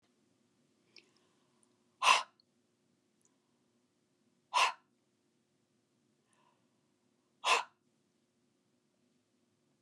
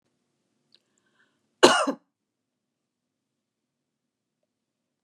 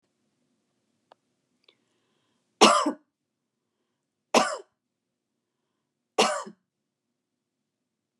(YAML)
exhalation_length: 9.8 s
exhalation_amplitude: 8553
exhalation_signal_mean_std_ratio: 0.19
cough_length: 5.0 s
cough_amplitude: 32767
cough_signal_mean_std_ratio: 0.16
three_cough_length: 8.2 s
three_cough_amplitude: 26222
three_cough_signal_mean_std_ratio: 0.21
survey_phase: beta (2021-08-13 to 2022-03-07)
age: 45-64
gender: Female
wearing_mask: 'No'
symptom_none: true
smoker_status: Never smoked
respiratory_condition_asthma: false
respiratory_condition_other: false
recruitment_source: REACT
submission_delay: 1 day
covid_test_result: Negative
covid_test_method: RT-qPCR